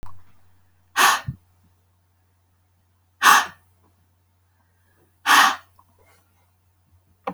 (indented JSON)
{
  "exhalation_length": "7.3 s",
  "exhalation_amplitude": 29630,
  "exhalation_signal_mean_std_ratio": 0.28,
  "survey_phase": "beta (2021-08-13 to 2022-03-07)",
  "age": "18-44",
  "gender": "Female",
  "wearing_mask": "No",
  "symptom_none": true,
  "smoker_status": "Ex-smoker",
  "respiratory_condition_asthma": false,
  "respiratory_condition_other": false,
  "recruitment_source": "REACT",
  "submission_delay": "3 days",
  "covid_test_result": "Negative",
  "covid_test_method": "RT-qPCR"
}